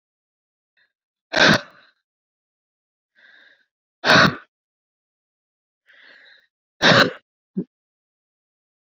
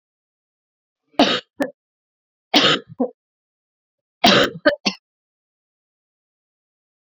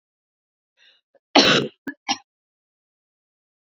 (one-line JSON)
{"exhalation_length": "8.9 s", "exhalation_amplitude": 29641, "exhalation_signal_mean_std_ratio": 0.24, "three_cough_length": "7.2 s", "three_cough_amplitude": 31473, "three_cough_signal_mean_std_ratio": 0.28, "cough_length": "3.8 s", "cough_amplitude": 29245, "cough_signal_mean_std_ratio": 0.24, "survey_phase": "alpha (2021-03-01 to 2021-08-12)", "age": "18-44", "gender": "Female", "wearing_mask": "No", "symptom_fatigue": true, "symptom_fever_high_temperature": true, "symptom_headache": true, "symptom_onset": "365 days", "smoker_status": "Never smoked", "respiratory_condition_asthma": false, "respiratory_condition_other": false, "recruitment_source": "Test and Trace", "submission_delay": "0 days", "covid_test_result": "Positive", "covid_test_method": "RT-qPCR", "covid_ct_value": 25.3, "covid_ct_gene": "ORF1ab gene", "covid_ct_mean": 25.4, "covid_viral_load": "4700 copies/ml", "covid_viral_load_category": "Minimal viral load (< 10K copies/ml)"}